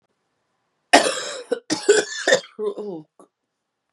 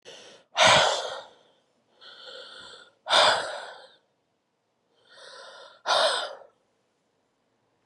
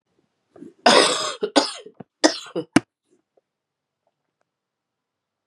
cough_length: 3.9 s
cough_amplitude: 32768
cough_signal_mean_std_ratio: 0.38
exhalation_length: 7.9 s
exhalation_amplitude: 19953
exhalation_signal_mean_std_ratio: 0.35
three_cough_length: 5.5 s
three_cough_amplitude: 32557
three_cough_signal_mean_std_ratio: 0.28
survey_phase: beta (2021-08-13 to 2022-03-07)
age: 18-44
gender: Female
wearing_mask: 'No'
symptom_cough_any: true
symptom_runny_or_blocked_nose: true
symptom_sore_throat: true
symptom_headache: true
symptom_change_to_sense_of_smell_or_taste: true
symptom_loss_of_taste: true
symptom_onset: 3 days
smoker_status: Ex-smoker
respiratory_condition_asthma: true
respiratory_condition_other: false
recruitment_source: Test and Trace
submission_delay: 1 day
covid_test_result: Positive
covid_test_method: ePCR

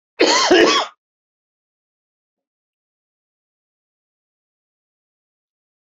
cough_length: 5.8 s
cough_amplitude: 32768
cough_signal_mean_std_ratio: 0.26
survey_phase: beta (2021-08-13 to 2022-03-07)
age: 65+
gender: Male
wearing_mask: 'No'
symptom_none: true
smoker_status: Never smoked
respiratory_condition_asthma: false
respiratory_condition_other: false
recruitment_source: REACT
submission_delay: 3 days
covid_test_result: Negative
covid_test_method: RT-qPCR
influenza_a_test_result: Negative
influenza_b_test_result: Negative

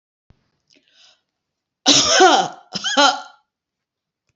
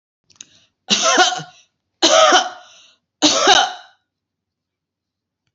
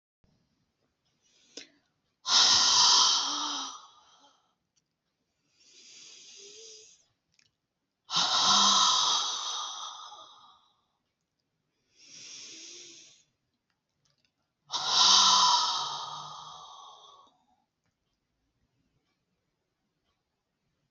cough_length: 4.4 s
cough_amplitude: 32144
cough_signal_mean_std_ratio: 0.37
three_cough_length: 5.5 s
three_cough_amplitude: 31027
three_cough_signal_mean_std_ratio: 0.41
exhalation_length: 20.9 s
exhalation_amplitude: 16112
exhalation_signal_mean_std_ratio: 0.37
survey_phase: beta (2021-08-13 to 2022-03-07)
age: 65+
gender: Female
wearing_mask: 'No'
symptom_cough_any: true
symptom_shortness_of_breath: true
smoker_status: Never smoked
respiratory_condition_asthma: false
respiratory_condition_other: false
recruitment_source: REACT
submission_delay: 1 day
covid_test_result: Negative
covid_test_method: RT-qPCR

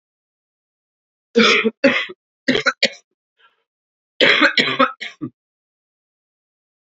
three_cough_length: 6.8 s
three_cough_amplitude: 28618
three_cough_signal_mean_std_ratio: 0.36
survey_phase: beta (2021-08-13 to 2022-03-07)
age: 45-64
gender: Female
wearing_mask: 'No'
symptom_cough_any: true
symptom_runny_or_blocked_nose: true
symptom_sore_throat: true
symptom_fatigue: true
symptom_onset: 2 days
smoker_status: Ex-smoker
respiratory_condition_asthma: false
respiratory_condition_other: false
recruitment_source: Test and Trace
submission_delay: 1 day
covid_test_result: Negative
covid_test_method: RT-qPCR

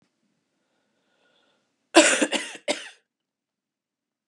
cough_length: 4.3 s
cough_amplitude: 31060
cough_signal_mean_std_ratio: 0.24
survey_phase: beta (2021-08-13 to 2022-03-07)
age: 45-64
gender: Female
wearing_mask: 'No'
symptom_cough_any: true
symptom_new_continuous_cough: true
symptom_runny_or_blocked_nose: true
symptom_shortness_of_breath: true
symptom_sore_throat: true
symptom_fatigue: true
symptom_onset: 3 days
smoker_status: Ex-smoker
respiratory_condition_asthma: false
respiratory_condition_other: false
recruitment_source: Test and Trace
submission_delay: 1 day
covid_test_result: Positive
covid_test_method: RT-qPCR
covid_ct_value: 12.6
covid_ct_gene: N gene
covid_ct_mean: 12.7
covid_viral_load: 68000000 copies/ml
covid_viral_load_category: High viral load (>1M copies/ml)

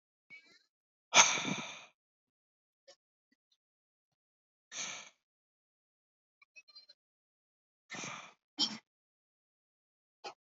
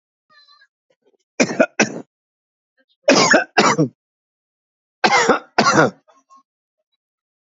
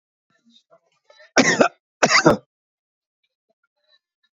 exhalation_length: 10.5 s
exhalation_amplitude: 13262
exhalation_signal_mean_std_ratio: 0.19
three_cough_length: 7.4 s
three_cough_amplitude: 32768
three_cough_signal_mean_std_ratio: 0.37
cough_length: 4.4 s
cough_amplitude: 28522
cough_signal_mean_std_ratio: 0.28
survey_phase: beta (2021-08-13 to 2022-03-07)
age: 45-64
gender: Male
wearing_mask: 'No'
symptom_none: true
smoker_status: Never smoked
respiratory_condition_asthma: false
respiratory_condition_other: false
recruitment_source: REACT
submission_delay: 3 days
covid_test_result: Negative
covid_test_method: RT-qPCR
influenza_a_test_result: Negative
influenza_b_test_result: Negative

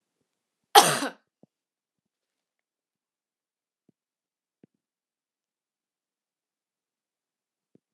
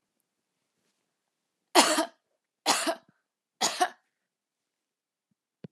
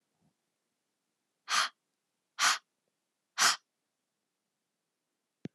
cough_length: 7.9 s
cough_amplitude: 32767
cough_signal_mean_std_ratio: 0.12
three_cough_length: 5.7 s
three_cough_amplitude: 22549
three_cough_signal_mean_std_ratio: 0.27
exhalation_length: 5.5 s
exhalation_amplitude: 8431
exhalation_signal_mean_std_ratio: 0.24
survey_phase: alpha (2021-03-01 to 2021-08-12)
age: 18-44
gender: Female
wearing_mask: 'No'
symptom_none: true
smoker_status: Never smoked
respiratory_condition_asthma: false
respiratory_condition_other: false
recruitment_source: REACT
submission_delay: 2 days
covid_test_result: Negative
covid_test_method: RT-qPCR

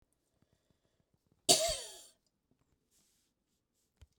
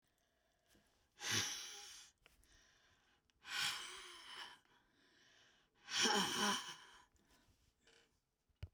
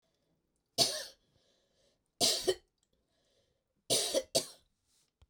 cough_length: 4.2 s
cough_amplitude: 10799
cough_signal_mean_std_ratio: 0.2
exhalation_length: 8.7 s
exhalation_amplitude: 2368
exhalation_signal_mean_std_ratio: 0.39
three_cough_length: 5.3 s
three_cough_amplitude: 6531
three_cough_signal_mean_std_ratio: 0.32
survey_phase: beta (2021-08-13 to 2022-03-07)
age: 65+
gender: Female
wearing_mask: 'No'
symptom_none: true
smoker_status: Ex-smoker
respiratory_condition_asthma: false
respiratory_condition_other: false
recruitment_source: REACT
submission_delay: 12 days
covid_test_result: Negative
covid_test_method: RT-qPCR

